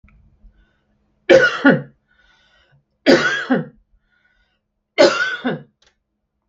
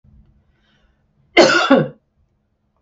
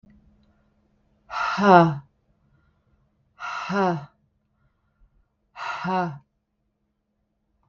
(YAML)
three_cough_length: 6.5 s
three_cough_amplitude: 32768
three_cough_signal_mean_std_ratio: 0.35
cough_length: 2.8 s
cough_amplitude: 32768
cough_signal_mean_std_ratio: 0.33
exhalation_length: 7.7 s
exhalation_amplitude: 30522
exhalation_signal_mean_std_ratio: 0.31
survey_phase: beta (2021-08-13 to 2022-03-07)
age: 45-64
gender: Female
wearing_mask: 'No'
symptom_none: true
smoker_status: Never smoked
respiratory_condition_asthma: false
respiratory_condition_other: false
recruitment_source: REACT
submission_delay: 1 day
covid_test_result: Negative
covid_test_method: RT-qPCR
influenza_a_test_result: Negative
influenza_b_test_result: Negative